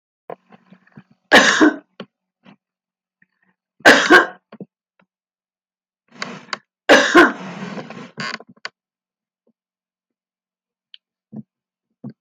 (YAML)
three_cough_length: 12.2 s
three_cough_amplitude: 32768
three_cough_signal_mean_std_ratio: 0.27
survey_phase: alpha (2021-03-01 to 2021-08-12)
age: 65+
gender: Female
wearing_mask: 'No'
symptom_none: true
smoker_status: Never smoked
respiratory_condition_asthma: false
respiratory_condition_other: true
recruitment_source: REACT
submission_delay: 2 days
covid_test_result: Negative
covid_test_method: RT-qPCR